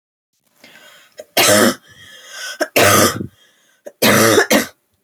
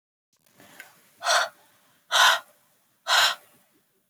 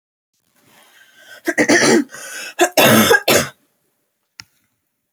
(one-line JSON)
{"three_cough_length": "5.0 s", "three_cough_amplitude": 32768, "three_cough_signal_mean_std_ratio": 0.48, "exhalation_length": "4.1 s", "exhalation_amplitude": 16757, "exhalation_signal_mean_std_ratio": 0.35, "cough_length": "5.1 s", "cough_amplitude": 32342, "cough_signal_mean_std_ratio": 0.42, "survey_phase": "beta (2021-08-13 to 2022-03-07)", "age": "18-44", "gender": "Female", "wearing_mask": "No", "symptom_none": true, "smoker_status": "Never smoked", "respiratory_condition_asthma": false, "respiratory_condition_other": false, "recruitment_source": "Test and Trace", "submission_delay": "0 days", "covid_test_result": "Negative", "covid_test_method": "LFT"}